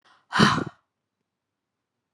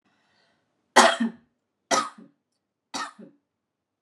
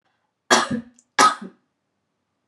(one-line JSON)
{"exhalation_length": "2.1 s", "exhalation_amplitude": 23832, "exhalation_signal_mean_std_ratio": 0.28, "three_cough_length": "4.0 s", "three_cough_amplitude": 26905, "three_cough_signal_mean_std_ratio": 0.26, "cough_length": "2.5 s", "cough_amplitude": 30955, "cough_signal_mean_std_ratio": 0.31, "survey_phase": "beta (2021-08-13 to 2022-03-07)", "age": "18-44", "gender": "Female", "wearing_mask": "No", "symptom_none": true, "smoker_status": "Never smoked", "respiratory_condition_asthma": false, "respiratory_condition_other": false, "recruitment_source": "REACT", "submission_delay": "4 days", "covid_test_result": "Negative", "covid_test_method": "RT-qPCR", "influenza_a_test_result": "Negative", "influenza_b_test_result": "Negative"}